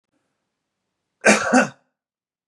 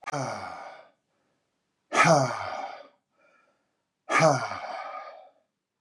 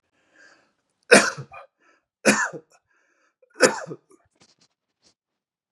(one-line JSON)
{"cough_length": "2.5 s", "cough_amplitude": 29839, "cough_signal_mean_std_ratio": 0.3, "exhalation_length": "5.8 s", "exhalation_amplitude": 16925, "exhalation_signal_mean_std_ratio": 0.4, "three_cough_length": "5.7 s", "three_cough_amplitude": 32706, "three_cough_signal_mean_std_ratio": 0.23, "survey_phase": "beta (2021-08-13 to 2022-03-07)", "age": "45-64", "gender": "Male", "wearing_mask": "No", "symptom_none": true, "smoker_status": "Never smoked", "respiratory_condition_asthma": false, "respiratory_condition_other": false, "recruitment_source": "Test and Trace", "submission_delay": "2 days", "covid_test_result": "Negative", "covid_test_method": "RT-qPCR"}